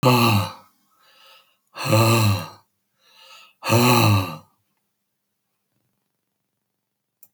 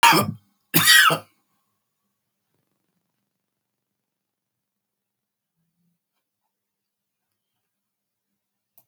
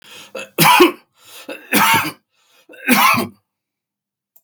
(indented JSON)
{
  "exhalation_length": "7.3 s",
  "exhalation_amplitude": 23030,
  "exhalation_signal_mean_std_ratio": 0.42,
  "cough_length": "8.9 s",
  "cough_amplitude": 32131,
  "cough_signal_mean_std_ratio": 0.21,
  "three_cough_length": "4.4 s",
  "three_cough_amplitude": 32768,
  "three_cough_signal_mean_std_ratio": 0.43,
  "survey_phase": "beta (2021-08-13 to 2022-03-07)",
  "age": "65+",
  "gender": "Male",
  "wearing_mask": "No",
  "symptom_none": true,
  "smoker_status": "Never smoked",
  "respiratory_condition_asthma": false,
  "respiratory_condition_other": false,
  "recruitment_source": "REACT",
  "submission_delay": "2 days",
  "covid_test_result": "Negative",
  "covid_test_method": "RT-qPCR"
}